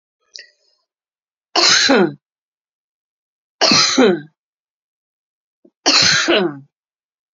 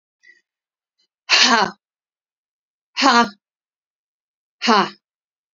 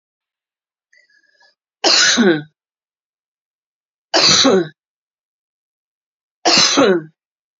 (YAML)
cough_length: 7.3 s
cough_amplitude: 32768
cough_signal_mean_std_ratio: 0.41
exhalation_length: 5.5 s
exhalation_amplitude: 32767
exhalation_signal_mean_std_ratio: 0.31
three_cough_length: 7.6 s
three_cough_amplitude: 32768
three_cough_signal_mean_std_ratio: 0.39
survey_phase: beta (2021-08-13 to 2022-03-07)
age: 45-64
gender: Female
wearing_mask: 'No'
symptom_none: true
smoker_status: Never smoked
respiratory_condition_asthma: true
respiratory_condition_other: false
recruitment_source: REACT
submission_delay: 4 days
covid_test_result: Negative
covid_test_method: RT-qPCR
influenza_a_test_result: Negative
influenza_b_test_result: Negative